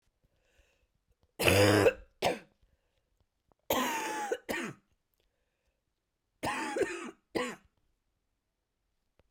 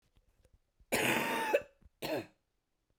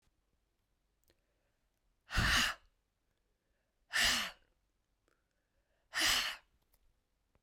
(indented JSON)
{
  "three_cough_length": "9.3 s",
  "three_cough_amplitude": 9313,
  "three_cough_signal_mean_std_ratio": 0.36,
  "cough_length": "3.0 s",
  "cough_amplitude": 5015,
  "cough_signal_mean_std_ratio": 0.45,
  "exhalation_length": "7.4 s",
  "exhalation_amplitude": 4855,
  "exhalation_signal_mean_std_ratio": 0.32,
  "survey_phase": "beta (2021-08-13 to 2022-03-07)",
  "age": "45-64",
  "gender": "Female",
  "wearing_mask": "No",
  "symptom_new_continuous_cough": true,
  "symptom_shortness_of_breath": true,
  "symptom_fatigue": true,
  "symptom_fever_high_temperature": true,
  "symptom_headache": true,
  "symptom_loss_of_taste": true,
  "symptom_other": true,
  "symptom_onset": "6 days",
  "smoker_status": "Never smoked",
  "respiratory_condition_asthma": true,
  "respiratory_condition_other": false,
  "recruitment_source": "Test and Trace",
  "submission_delay": "2 days",
  "covid_test_result": "Positive",
  "covid_test_method": "RT-qPCR",
  "covid_ct_value": 22.3,
  "covid_ct_gene": "ORF1ab gene"
}